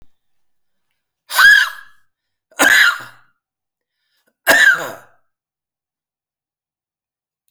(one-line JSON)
{"three_cough_length": "7.5 s", "three_cough_amplitude": 32768, "three_cough_signal_mean_std_ratio": 0.32, "survey_phase": "alpha (2021-03-01 to 2021-08-12)", "age": "65+", "gender": "Male", "wearing_mask": "No", "symptom_none": true, "smoker_status": "Never smoked", "respiratory_condition_asthma": false, "respiratory_condition_other": false, "recruitment_source": "REACT", "submission_delay": "1 day", "covid_test_result": "Negative", "covid_test_method": "RT-qPCR"}